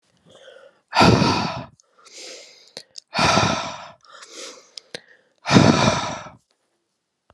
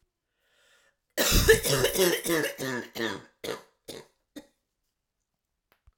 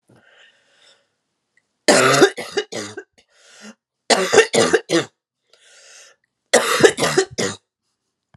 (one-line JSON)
{"exhalation_length": "7.3 s", "exhalation_amplitude": 32767, "exhalation_signal_mean_std_ratio": 0.4, "cough_length": "6.0 s", "cough_amplitude": 19836, "cough_signal_mean_std_ratio": 0.41, "three_cough_length": "8.4 s", "three_cough_amplitude": 32768, "three_cough_signal_mean_std_ratio": 0.38, "survey_phase": "alpha (2021-03-01 to 2021-08-12)", "age": "45-64", "gender": "Female", "wearing_mask": "No", "symptom_cough_any": true, "symptom_shortness_of_breath": true, "symptom_fatigue": true, "symptom_headache": true, "symptom_onset": "3 days", "smoker_status": "Never smoked", "respiratory_condition_asthma": false, "respiratory_condition_other": false, "recruitment_source": "Test and Trace", "submission_delay": "2 days", "covid_test_result": "Positive", "covid_test_method": "ePCR"}